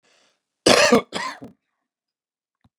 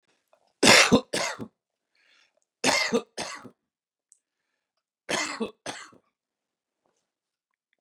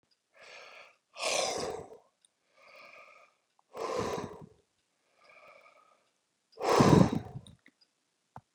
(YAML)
cough_length: 2.8 s
cough_amplitude: 31524
cough_signal_mean_std_ratio: 0.3
three_cough_length: 7.8 s
three_cough_amplitude: 28041
three_cough_signal_mean_std_ratio: 0.28
exhalation_length: 8.5 s
exhalation_amplitude: 12260
exhalation_signal_mean_std_ratio: 0.3
survey_phase: beta (2021-08-13 to 2022-03-07)
age: 65+
gender: Male
wearing_mask: 'No'
symptom_none: true
smoker_status: Never smoked
respiratory_condition_asthma: false
respiratory_condition_other: false
recruitment_source: REACT
submission_delay: 0 days
covid_test_result: Negative
covid_test_method: RT-qPCR